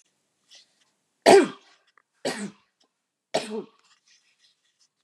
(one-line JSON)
{"three_cough_length": "5.0 s", "three_cough_amplitude": 26697, "three_cough_signal_mean_std_ratio": 0.22, "survey_phase": "beta (2021-08-13 to 2022-03-07)", "age": "45-64", "gender": "Female", "wearing_mask": "No", "symptom_fatigue": true, "smoker_status": "Never smoked", "respiratory_condition_asthma": false, "respiratory_condition_other": false, "recruitment_source": "REACT", "submission_delay": "1 day", "covid_test_result": "Negative", "covid_test_method": "RT-qPCR", "influenza_a_test_result": "Negative", "influenza_b_test_result": "Negative"}